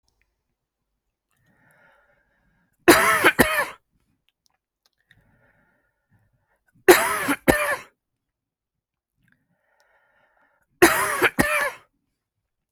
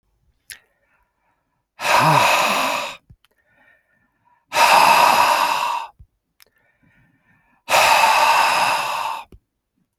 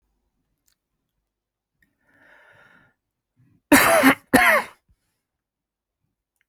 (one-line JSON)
{"three_cough_length": "12.7 s", "three_cough_amplitude": 31609, "three_cough_signal_mean_std_ratio": 0.29, "exhalation_length": "10.0 s", "exhalation_amplitude": 27354, "exhalation_signal_mean_std_ratio": 0.53, "cough_length": "6.5 s", "cough_amplitude": 29778, "cough_signal_mean_std_ratio": 0.26, "survey_phase": "beta (2021-08-13 to 2022-03-07)", "age": "45-64", "gender": "Male", "wearing_mask": "No", "symptom_runny_or_blocked_nose": true, "symptom_sore_throat": true, "symptom_fatigue": true, "symptom_headache": true, "symptom_onset": "13 days", "smoker_status": "Current smoker (11 or more cigarettes per day)", "respiratory_condition_asthma": false, "respiratory_condition_other": false, "recruitment_source": "REACT", "submission_delay": "2 days", "covid_test_result": "Negative", "covid_test_method": "RT-qPCR"}